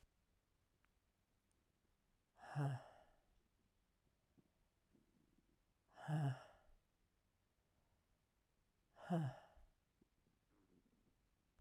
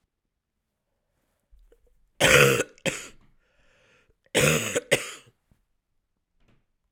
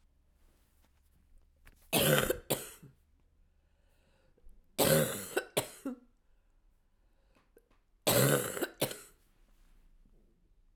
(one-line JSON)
{"exhalation_length": "11.6 s", "exhalation_amplitude": 854, "exhalation_signal_mean_std_ratio": 0.27, "cough_length": "6.9 s", "cough_amplitude": 27498, "cough_signal_mean_std_ratio": 0.3, "three_cough_length": "10.8 s", "three_cough_amplitude": 9495, "three_cough_signal_mean_std_ratio": 0.34, "survey_phase": "beta (2021-08-13 to 2022-03-07)", "age": "45-64", "gender": "Female", "wearing_mask": "No", "symptom_cough_any": true, "symptom_new_continuous_cough": true, "symptom_runny_or_blocked_nose": true, "symptom_shortness_of_breath": true, "symptom_sore_throat": true, "symptom_abdominal_pain": true, "symptom_fatigue": true, "symptom_fever_high_temperature": true, "symptom_headache": true, "symptom_change_to_sense_of_smell_or_taste": true, "symptom_onset": "4 days", "smoker_status": "Current smoker (1 to 10 cigarettes per day)", "respiratory_condition_asthma": false, "respiratory_condition_other": false, "recruitment_source": "Test and Trace", "submission_delay": "2 days", "covid_test_result": "Positive", "covid_test_method": "RT-qPCR"}